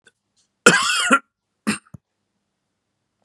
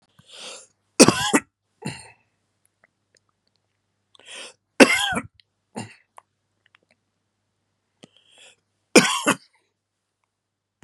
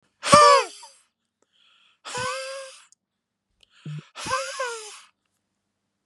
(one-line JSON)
{"cough_length": "3.2 s", "cough_amplitude": 32768, "cough_signal_mean_std_ratio": 0.31, "three_cough_length": "10.8 s", "three_cough_amplitude": 32768, "three_cough_signal_mean_std_ratio": 0.21, "exhalation_length": "6.1 s", "exhalation_amplitude": 30500, "exhalation_signal_mean_std_ratio": 0.3, "survey_phase": "beta (2021-08-13 to 2022-03-07)", "age": "45-64", "gender": "Male", "wearing_mask": "No", "symptom_cough_any": true, "symptom_fatigue": true, "symptom_headache": true, "smoker_status": "Never smoked", "respiratory_condition_asthma": false, "respiratory_condition_other": false, "recruitment_source": "Test and Trace", "submission_delay": "2 days", "covid_test_result": "Positive", "covid_test_method": "RT-qPCR"}